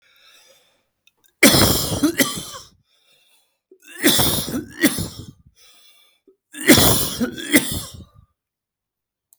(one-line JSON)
{"three_cough_length": "9.4 s", "three_cough_amplitude": 32768, "three_cough_signal_mean_std_ratio": 0.4, "survey_phase": "beta (2021-08-13 to 2022-03-07)", "age": "45-64", "gender": "Male", "wearing_mask": "No", "symptom_none": true, "smoker_status": "Never smoked", "respiratory_condition_asthma": true, "respiratory_condition_other": false, "recruitment_source": "REACT", "submission_delay": "1 day", "covid_test_result": "Negative", "covid_test_method": "RT-qPCR", "influenza_a_test_result": "Negative", "influenza_b_test_result": "Negative"}